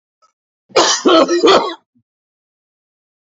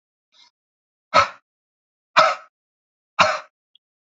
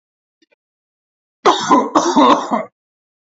{"cough_length": "3.2 s", "cough_amplitude": 30610, "cough_signal_mean_std_ratio": 0.43, "exhalation_length": "4.2 s", "exhalation_amplitude": 28428, "exhalation_signal_mean_std_ratio": 0.26, "three_cough_length": "3.2 s", "three_cough_amplitude": 29907, "three_cough_signal_mean_std_ratio": 0.44, "survey_phase": "beta (2021-08-13 to 2022-03-07)", "age": "45-64", "gender": "Male", "wearing_mask": "No", "symptom_none": true, "smoker_status": "Ex-smoker", "respiratory_condition_asthma": false, "respiratory_condition_other": false, "recruitment_source": "REACT", "submission_delay": "1 day", "covid_test_result": "Negative", "covid_test_method": "RT-qPCR", "influenza_a_test_result": "Negative", "influenza_b_test_result": "Negative"}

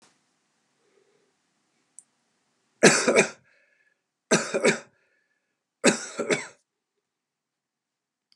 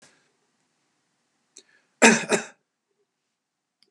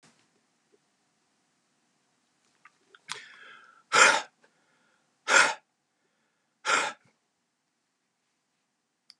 {"three_cough_length": "8.4 s", "three_cough_amplitude": 28563, "three_cough_signal_mean_std_ratio": 0.27, "cough_length": "3.9 s", "cough_amplitude": 32338, "cough_signal_mean_std_ratio": 0.2, "exhalation_length": "9.2 s", "exhalation_amplitude": 18046, "exhalation_signal_mean_std_ratio": 0.22, "survey_phase": "beta (2021-08-13 to 2022-03-07)", "age": "65+", "gender": "Male", "wearing_mask": "No", "symptom_none": true, "smoker_status": "Never smoked", "respiratory_condition_asthma": false, "respiratory_condition_other": false, "recruitment_source": "REACT", "submission_delay": "1 day", "covid_test_result": "Negative", "covid_test_method": "RT-qPCR"}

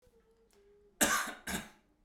{"cough_length": "2.0 s", "cough_amplitude": 7908, "cough_signal_mean_std_ratio": 0.37, "survey_phase": "beta (2021-08-13 to 2022-03-07)", "age": "18-44", "gender": "Male", "wearing_mask": "No", "symptom_cough_any": true, "smoker_status": "Never smoked", "respiratory_condition_asthma": false, "respiratory_condition_other": false, "recruitment_source": "REACT", "submission_delay": "1 day", "covid_test_result": "Negative", "covid_test_method": "RT-qPCR", "influenza_a_test_result": "Negative", "influenza_b_test_result": "Negative"}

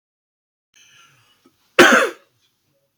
{"cough_length": "3.0 s", "cough_amplitude": 31315, "cough_signal_mean_std_ratio": 0.26, "survey_phase": "alpha (2021-03-01 to 2021-08-12)", "age": "45-64", "gender": "Male", "wearing_mask": "No", "symptom_none": true, "symptom_onset": "12 days", "smoker_status": "Never smoked", "respiratory_condition_asthma": false, "respiratory_condition_other": false, "recruitment_source": "REACT", "submission_delay": "1 day", "covid_test_result": "Negative", "covid_test_method": "RT-qPCR"}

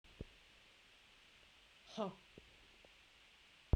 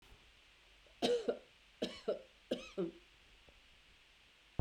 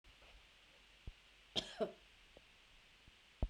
{"exhalation_length": "3.8 s", "exhalation_amplitude": 3494, "exhalation_signal_mean_std_ratio": 0.23, "three_cough_length": "4.6 s", "three_cough_amplitude": 2974, "three_cough_signal_mean_std_ratio": 0.37, "cough_length": "3.5 s", "cough_amplitude": 2108, "cough_signal_mean_std_ratio": 0.32, "survey_phase": "beta (2021-08-13 to 2022-03-07)", "age": "45-64", "gender": "Female", "wearing_mask": "No", "symptom_cough_any": true, "symptom_runny_or_blocked_nose": true, "symptom_sore_throat": true, "symptom_fatigue": true, "symptom_fever_high_temperature": true, "symptom_headache": true, "smoker_status": "Ex-smoker", "respiratory_condition_asthma": false, "respiratory_condition_other": false, "recruitment_source": "Test and Trace", "submission_delay": "2 days", "covid_test_result": "Positive", "covid_test_method": "RT-qPCR", "covid_ct_value": 17.2, "covid_ct_gene": "ORF1ab gene", "covid_ct_mean": 17.9, "covid_viral_load": "1400000 copies/ml", "covid_viral_load_category": "High viral load (>1M copies/ml)"}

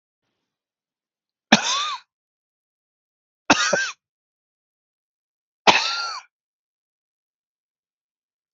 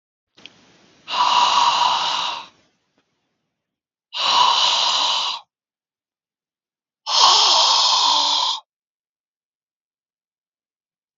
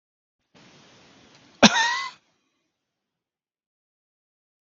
{"three_cough_length": "8.5 s", "three_cough_amplitude": 32697, "three_cough_signal_mean_std_ratio": 0.25, "exhalation_length": "11.2 s", "exhalation_amplitude": 32697, "exhalation_signal_mean_std_ratio": 0.51, "cough_length": "4.6 s", "cough_amplitude": 32697, "cough_signal_mean_std_ratio": 0.2, "survey_phase": "beta (2021-08-13 to 2022-03-07)", "age": "65+", "gender": "Male", "wearing_mask": "No", "symptom_runny_or_blocked_nose": true, "symptom_sore_throat": true, "symptom_headache": true, "symptom_onset": "12 days", "smoker_status": "Never smoked", "respiratory_condition_asthma": false, "respiratory_condition_other": false, "recruitment_source": "REACT", "submission_delay": "7 days", "covid_test_result": "Negative", "covid_test_method": "RT-qPCR", "influenza_a_test_result": "Negative", "influenza_b_test_result": "Negative"}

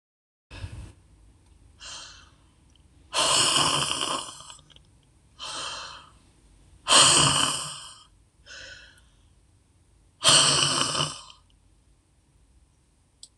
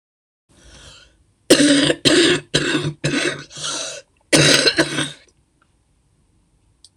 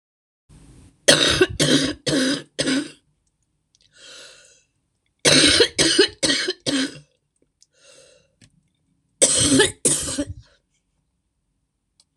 {"exhalation_length": "13.4 s", "exhalation_amplitude": 21669, "exhalation_signal_mean_std_ratio": 0.39, "cough_length": "7.0 s", "cough_amplitude": 26028, "cough_signal_mean_std_ratio": 0.47, "three_cough_length": "12.2 s", "three_cough_amplitude": 26028, "three_cough_signal_mean_std_ratio": 0.42, "survey_phase": "alpha (2021-03-01 to 2021-08-12)", "age": "65+", "gender": "Female", "wearing_mask": "No", "symptom_cough_any": true, "symptom_shortness_of_breath": true, "smoker_status": "Ex-smoker", "respiratory_condition_asthma": false, "respiratory_condition_other": true, "recruitment_source": "REACT", "submission_delay": "1 day", "covid_test_result": "Negative", "covid_test_method": "RT-qPCR"}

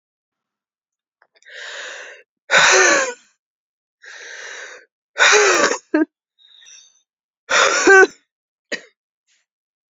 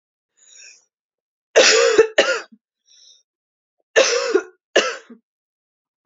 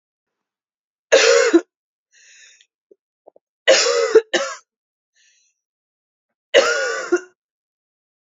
{"exhalation_length": "9.9 s", "exhalation_amplitude": 32767, "exhalation_signal_mean_std_ratio": 0.37, "cough_length": "6.1 s", "cough_amplitude": 28952, "cough_signal_mean_std_ratio": 0.36, "three_cough_length": "8.3 s", "three_cough_amplitude": 32768, "three_cough_signal_mean_std_ratio": 0.35, "survey_phase": "beta (2021-08-13 to 2022-03-07)", "age": "18-44", "gender": "Female", "wearing_mask": "No", "symptom_cough_any": true, "symptom_new_continuous_cough": true, "symptom_runny_or_blocked_nose": true, "symptom_sore_throat": true, "symptom_headache": true, "symptom_onset": "1 day", "smoker_status": "Never smoked", "respiratory_condition_asthma": false, "respiratory_condition_other": false, "recruitment_source": "Test and Trace", "submission_delay": "1 day", "covid_test_result": "Negative", "covid_test_method": "RT-qPCR"}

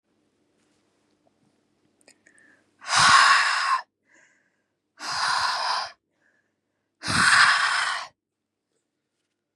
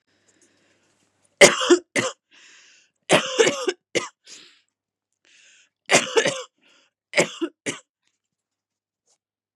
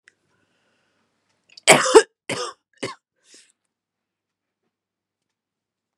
{"exhalation_length": "9.6 s", "exhalation_amplitude": 21847, "exhalation_signal_mean_std_ratio": 0.41, "three_cough_length": "9.6 s", "three_cough_amplitude": 32768, "three_cough_signal_mean_std_ratio": 0.29, "cough_length": "6.0 s", "cough_amplitude": 32768, "cough_signal_mean_std_ratio": 0.18, "survey_phase": "beta (2021-08-13 to 2022-03-07)", "age": "18-44", "gender": "Female", "wearing_mask": "No", "symptom_cough_any": true, "symptom_shortness_of_breath": true, "symptom_sore_throat": true, "symptom_fatigue": true, "symptom_headache": true, "symptom_onset": "8 days", "smoker_status": "Never smoked", "respiratory_condition_asthma": false, "respiratory_condition_other": false, "recruitment_source": "Test and Trace", "submission_delay": "1 day", "covid_test_result": "Positive", "covid_test_method": "RT-qPCR", "covid_ct_value": 25.7, "covid_ct_gene": "ORF1ab gene", "covid_ct_mean": 26.1, "covid_viral_load": "2800 copies/ml", "covid_viral_load_category": "Minimal viral load (< 10K copies/ml)"}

